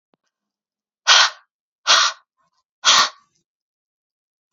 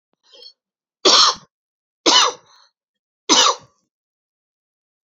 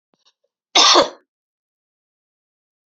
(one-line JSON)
{"exhalation_length": "4.5 s", "exhalation_amplitude": 32767, "exhalation_signal_mean_std_ratio": 0.31, "three_cough_length": "5.0 s", "three_cough_amplitude": 32768, "three_cough_signal_mean_std_ratio": 0.32, "cough_length": "2.9 s", "cough_amplitude": 32767, "cough_signal_mean_std_ratio": 0.27, "survey_phase": "alpha (2021-03-01 to 2021-08-12)", "age": "18-44", "gender": "Female", "wearing_mask": "No", "symptom_cough_any": true, "symptom_fatigue": true, "symptom_onset": "5 days", "smoker_status": "Never smoked", "respiratory_condition_asthma": false, "respiratory_condition_other": false, "recruitment_source": "Test and Trace", "submission_delay": "2 days", "covid_test_result": "Positive", "covid_test_method": "RT-qPCR", "covid_ct_value": 23.4, "covid_ct_gene": "ORF1ab gene"}